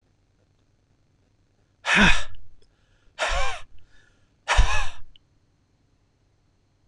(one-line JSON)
{"exhalation_length": "6.9 s", "exhalation_amplitude": 23740, "exhalation_signal_mean_std_ratio": 0.4, "survey_phase": "beta (2021-08-13 to 2022-03-07)", "age": "45-64", "gender": "Male", "wearing_mask": "No", "symptom_cough_any": true, "symptom_onset": "6 days", "smoker_status": "Never smoked", "respiratory_condition_asthma": true, "respiratory_condition_other": false, "recruitment_source": "REACT", "submission_delay": "1 day", "covid_test_result": "Negative", "covid_test_method": "RT-qPCR", "influenza_a_test_result": "Unknown/Void", "influenza_b_test_result": "Unknown/Void"}